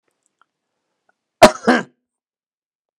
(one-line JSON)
{"cough_length": "3.0 s", "cough_amplitude": 32768, "cough_signal_mean_std_ratio": 0.19, "survey_phase": "beta (2021-08-13 to 2022-03-07)", "age": "65+", "gender": "Male", "wearing_mask": "No", "symptom_cough_any": true, "symptom_runny_or_blocked_nose": true, "symptom_fatigue": true, "symptom_headache": true, "symptom_onset": "13 days", "smoker_status": "Ex-smoker", "respiratory_condition_asthma": false, "respiratory_condition_other": false, "recruitment_source": "REACT", "submission_delay": "1 day", "covid_test_result": "Negative", "covid_test_method": "RT-qPCR", "influenza_a_test_result": "Unknown/Void", "influenza_b_test_result": "Unknown/Void"}